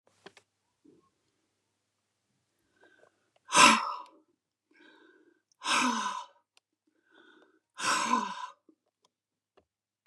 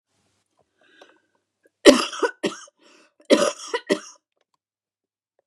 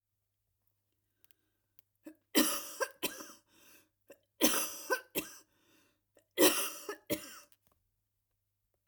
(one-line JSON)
{"exhalation_length": "10.1 s", "exhalation_amplitude": 17496, "exhalation_signal_mean_std_ratio": 0.27, "cough_length": "5.5 s", "cough_amplitude": 32768, "cough_signal_mean_std_ratio": 0.25, "three_cough_length": "8.9 s", "three_cough_amplitude": 10455, "three_cough_signal_mean_std_ratio": 0.3, "survey_phase": "alpha (2021-03-01 to 2021-08-12)", "age": "65+", "gender": "Female", "wearing_mask": "No", "symptom_fatigue": true, "symptom_onset": "12 days", "smoker_status": "Never smoked", "respiratory_condition_asthma": true, "respiratory_condition_other": true, "recruitment_source": "REACT", "submission_delay": "2 days", "covid_test_result": "Negative", "covid_test_method": "RT-qPCR"}